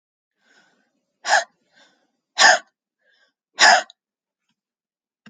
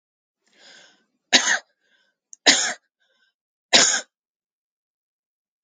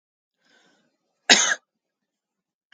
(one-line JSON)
{"exhalation_length": "5.3 s", "exhalation_amplitude": 31720, "exhalation_signal_mean_std_ratio": 0.25, "three_cough_length": "5.6 s", "three_cough_amplitude": 32767, "three_cough_signal_mean_std_ratio": 0.27, "cough_length": "2.7 s", "cough_amplitude": 32768, "cough_signal_mean_std_ratio": 0.21, "survey_phase": "alpha (2021-03-01 to 2021-08-12)", "age": "18-44", "gender": "Female", "wearing_mask": "No", "symptom_none": true, "smoker_status": "Never smoked", "respiratory_condition_asthma": true, "respiratory_condition_other": false, "recruitment_source": "REACT", "submission_delay": "2 days", "covid_test_result": "Negative", "covid_test_method": "RT-qPCR"}